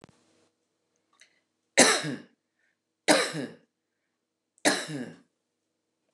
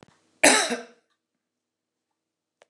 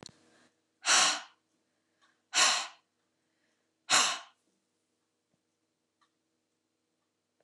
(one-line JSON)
{"three_cough_length": "6.1 s", "three_cough_amplitude": 22762, "three_cough_signal_mean_std_ratio": 0.28, "cough_length": "2.7 s", "cough_amplitude": 29204, "cough_signal_mean_std_ratio": 0.25, "exhalation_length": "7.4 s", "exhalation_amplitude": 9479, "exhalation_signal_mean_std_ratio": 0.27, "survey_phase": "beta (2021-08-13 to 2022-03-07)", "age": "45-64", "gender": "Female", "wearing_mask": "No", "symptom_cough_any": true, "symptom_shortness_of_breath": true, "symptom_other": true, "symptom_onset": "2 days", "smoker_status": "Never smoked", "respiratory_condition_asthma": true, "respiratory_condition_other": false, "recruitment_source": "Test and Trace", "submission_delay": "1 day", "covid_test_result": "Negative", "covid_test_method": "RT-qPCR"}